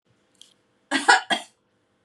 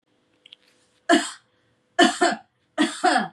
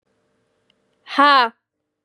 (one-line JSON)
{"cough_length": "2.0 s", "cough_amplitude": 28640, "cough_signal_mean_std_ratio": 0.29, "three_cough_length": "3.3 s", "three_cough_amplitude": 22429, "three_cough_signal_mean_std_ratio": 0.4, "exhalation_length": "2.0 s", "exhalation_amplitude": 29333, "exhalation_signal_mean_std_ratio": 0.3, "survey_phase": "beta (2021-08-13 to 2022-03-07)", "age": "18-44", "gender": "Female", "wearing_mask": "No", "symptom_none": true, "smoker_status": "Never smoked", "respiratory_condition_asthma": false, "respiratory_condition_other": false, "recruitment_source": "REACT", "submission_delay": "1 day", "covid_test_result": "Negative", "covid_test_method": "RT-qPCR", "influenza_a_test_result": "Negative", "influenza_b_test_result": "Negative"}